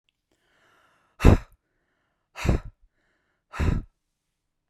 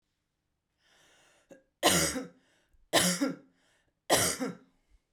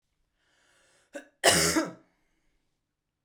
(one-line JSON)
{"exhalation_length": "4.7 s", "exhalation_amplitude": 32767, "exhalation_signal_mean_std_ratio": 0.24, "three_cough_length": "5.1 s", "three_cough_amplitude": 12079, "three_cough_signal_mean_std_ratio": 0.38, "cough_length": "3.2 s", "cough_amplitude": 18352, "cough_signal_mean_std_ratio": 0.29, "survey_phase": "beta (2021-08-13 to 2022-03-07)", "age": "45-64", "gender": "Female", "wearing_mask": "No", "symptom_none": true, "smoker_status": "Ex-smoker", "respiratory_condition_asthma": true, "respiratory_condition_other": false, "recruitment_source": "REACT", "submission_delay": "1 day", "covid_test_result": "Negative", "covid_test_method": "RT-qPCR"}